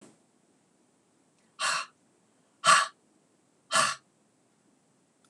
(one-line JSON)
{"exhalation_length": "5.3 s", "exhalation_amplitude": 16260, "exhalation_signal_mean_std_ratio": 0.27, "survey_phase": "beta (2021-08-13 to 2022-03-07)", "age": "65+", "gender": "Female", "wearing_mask": "No", "symptom_none": true, "smoker_status": "Ex-smoker", "respiratory_condition_asthma": false, "respiratory_condition_other": false, "recruitment_source": "REACT", "submission_delay": "0 days", "covid_test_result": "Negative", "covid_test_method": "RT-qPCR", "influenza_a_test_result": "Negative", "influenza_b_test_result": "Negative"}